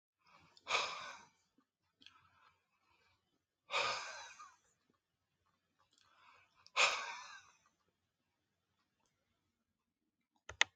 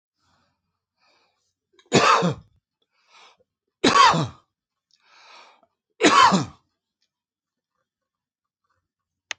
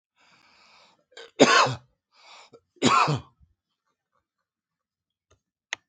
exhalation_length: 10.8 s
exhalation_amplitude: 10655
exhalation_signal_mean_std_ratio: 0.25
three_cough_length: 9.4 s
three_cough_amplitude: 27311
three_cough_signal_mean_std_ratio: 0.29
cough_length: 5.9 s
cough_amplitude: 27060
cough_signal_mean_std_ratio: 0.27
survey_phase: alpha (2021-03-01 to 2021-08-12)
age: 65+
gender: Male
wearing_mask: 'No'
symptom_none: true
smoker_status: Current smoker (11 or more cigarettes per day)
respiratory_condition_asthma: true
respiratory_condition_other: false
recruitment_source: REACT
submission_delay: 2 days
covid_test_result: Negative
covid_test_method: RT-qPCR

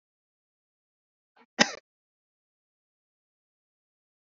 cough_length: 4.4 s
cough_amplitude: 25212
cough_signal_mean_std_ratio: 0.09
survey_phase: beta (2021-08-13 to 2022-03-07)
age: 18-44
gender: Male
wearing_mask: 'No'
symptom_cough_any: true
symptom_other: true
smoker_status: Never smoked
respiratory_condition_asthma: true
respiratory_condition_other: false
recruitment_source: Test and Trace
submission_delay: -1 day
covid_test_result: Negative
covid_test_method: LFT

